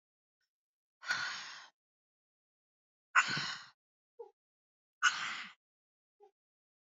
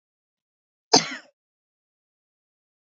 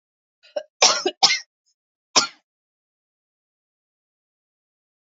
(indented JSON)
{
  "exhalation_length": "6.8 s",
  "exhalation_amplitude": 7513,
  "exhalation_signal_mean_std_ratio": 0.28,
  "cough_length": "3.0 s",
  "cough_amplitude": 25980,
  "cough_signal_mean_std_ratio": 0.15,
  "three_cough_length": "5.1 s",
  "three_cough_amplitude": 32767,
  "three_cough_signal_mean_std_ratio": 0.23,
  "survey_phase": "beta (2021-08-13 to 2022-03-07)",
  "age": "18-44",
  "gender": "Female",
  "wearing_mask": "No",
  "symptom_cough_any": true,
  "symptom_runny_or_blocked_nose": true,
  "symptom_shortness_of_breath": true,
  "symptom_sore_throat": true,
  "symptom_fatigue": true,
  "symptom_fever_high_temperature": true,
  "symptom_headache": true,
  "symptom_change_to_sense_of_smell_or_taste": true,
  "symptom_loss_of_taste": true,
  "symptom_onset": "5 days",
  "smoker_status": "Never smoked",
  "respiratory_condition_asthma": false,
  "respiratory_condition_other": false,
  "recruitment_source": "Test and Trace",
  "submission_delay": "2 days",
  "covid_test_result": "Positive",
  "covid_test_method": "RT-qPCR",
  "covid_ct_value": 27.7,
  "covid_ct_gene": "ORF1ab gene"
}